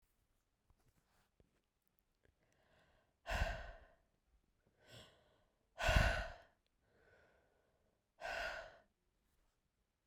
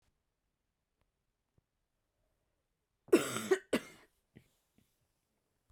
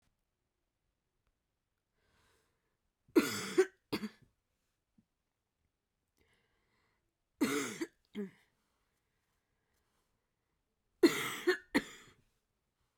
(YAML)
exhalation_length: 10.1 s
exhalation_amplitude: 3736
exhalation_signal_mean_std_ratio: 0.27
cough_length: 5.7 s
cough_amplitude: 6560
cough_signal_mean_std_ratio: 0.19
three_cough_length: 13.0 s
three_cough_amplitude: 6585
three_cough_signal_mean_std_ratio: 0.23
survey_phase: beta (2021-08-13 to 2022-03-07)
age: 18-44
gender: Female
wearing_mask: 'No'
symptom_cough_any: true
symptom_new_continuous_cough: true
symptom_runny_or_blocked_nose: true
symptom_sore_throat: true
symptom_fatigue: true
symptom_headache: true
smoker_status: Never smoked
respiratory_condition_asthma: false
respiratory_condition_other: false
recruitment_source: Test and Trace
submission_delay: 18 days
covid_test_result: Negative
covid_test_method: RT-qPCR